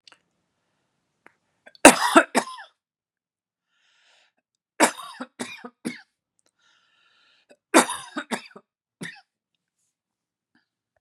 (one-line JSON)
{"three_cough_length": "11.0 s", "three_cough_amplitude": 32768, "three_cough_signal_mean_std_ratio": 0.19, "survey_phase": "beta (2021-08-13 to 2022-03-07)", "age": "45-64", "gender": "Male", "wearing_mask": "No", "symptom_none": true, "smoker_status": "Never smoked", "respiratory_condition_asthma": false, "respiratory_condition_other": false, "recruitment_source": "REACT", "submission_delay": "0 days", "covid_test_result": "Negative", "covid_test_method": "RT-qPCR"}